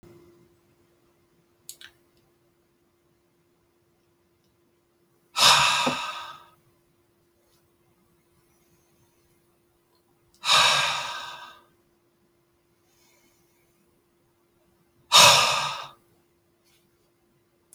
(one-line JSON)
{"exhalation_length": "17.7 s", "exhalation_amplitude": 27398, "exhalation_signal_mean_std_ratio": 0.26, "survey_phase": "alpha (2021-03-01 to 2021-08-12)", "age": "45-64", "gender": "Male", "wearing_mask": "No", "symptom_none": true, "smoker_status": "Never smoked", "respiratory_condition_asthma": false, "respiratory_condition_other": false, "recruitment_source": "REACT", "submission_delay": "3 days", "covid_test_result": "Negative", "covid_test_method": "RT-qPCR"}